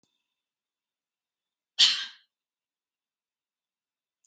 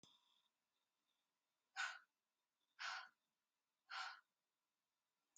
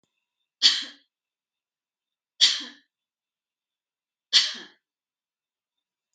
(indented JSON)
{
  "cough_length": "4.3 s",
  "cough_amplitude": 16186,
  "cough_signal_mean_std_ratio": 0.17,
  "exhalation_length": "5.4 s",
  "exhalation_amplitude": 633,
  "exhalation_signal_mean_std_ratio": 0.3,
  "three_cough_length": "6.1 s",
  "three_cough_amplitude": 24215,
  "three_cough_signal_mean_std_ratio": 0.22,
  "survey_phase": "beta (2021-08-13 to 2022-03-07)",
  "age": "45-64",
  "gender": "Female",
  "wearing_mask": "No",
  "symptom_none": true,
  "smoker_status": "Never smoked",
  "respiratory_condition_asthma": true,
  "respiratory_condition_other": false,
  "recruitment_source": "REACT",
  "submission_delay": "2 days",
  "covid_test_result": "Negative",
  "covid_test_method": "RT-qPCR",
  "influenza_a_test_result": "Unknown/Void",
  "influenza_b_test_result": "Unknown/Void"
}